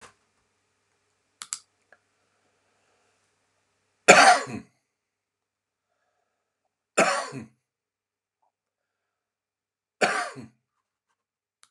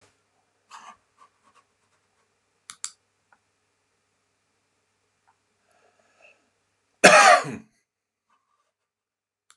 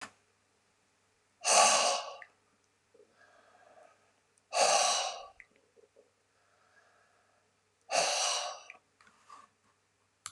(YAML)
three_cough_length: 11.7 s
three_cough_amplitude: 31628
three_cough_signal_mean_std_ratio: 0.19
cough_length: 9.6 s
cough_amplitude: 32580
cough_signal_mean_std_ratio: 0.17
exhalation_length: 10.3 s
exhalation_amplitude: 9298
exhalation_signal_mean_std_ratio: 0.34
survey_phase: beta (2021-08-13 to 2022-03-07)
age: 65+
gender: Male
wearing_mask: 'No'
symptom_none: true
smoker_status: Current smoker (1 to 10 cigarettes per day)
respiratory_condition_asthma: false
respiratory_condition_other: false
recruitment_source: REACT
submission_delay: 3 days
covid_test_result: Negative
covid_test_method: RT-qPCR
influenza_a_test_result: Negative
influenza_b_test_result: Negative